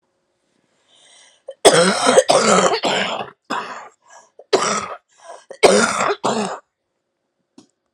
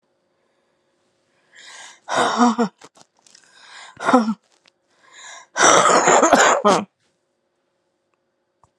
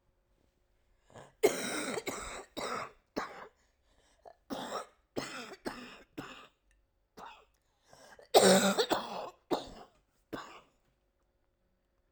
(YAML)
cough_length: 7.9 s
cough_amplitude: 32768
cough_signal_mean_std_ratio: 0.46
exhalation_length: 8.8 s
exhalation_amplitude: 32767
exhalation_signal_mean_std_ratio: 0.39
three_cough_length: 12.1 s
three_cough_amplitude: 10896
three_cough_signal_mean_std_ratio: 0.32
survey_phase: alpha (2021-03-01 to 2021-08-12)
age: 45-64
gender: Female
wearing_mask: 'No'
symptom_cough_any: true
symptom_shortness_of_breath: true
symptom_diarrhoea: true
symptom_fatigue: true
symptom_fever_high_temperature: true
symptom_headache: true
symptom_onset: 5 days
smoker_status: Never smoked
respiratory_condition_asthma: true
respiratory_condition_other: false
recruitment_source: Test and Trace
submission_delay: 2 days
covid_test_result: Positive
covid_test_method: RT-qPCR
covid_ct_value: 16.4
covid_ct_gene: ORF1ab gene
covid_ct_mean: 16.8
covid_viral_load: 3000000 copies/ml
covid_viral_load_category: High viral load (>1M copies/ml)